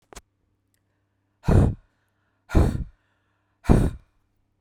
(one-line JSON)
{"exhalation_length": "4.6 s", "exhalation_amplitude": 23981, "exhalation_signal_mean_std_ratio": 0.32, "survey_phase": "beta (2021-08-13 to 2022-03-07)", "age": "45-64", "gender": "Female", "wearing_mask": "No", "symptom_none": true, "smoker_status": "Never smoked", "respiratory_condition_asthma": false, "respiratory_condition_other": false, "recruitment_source": "REACT", "submission_delay": "1 day", "covid_test_result": "Negative", "covid_test_method": "RT-qPCR"}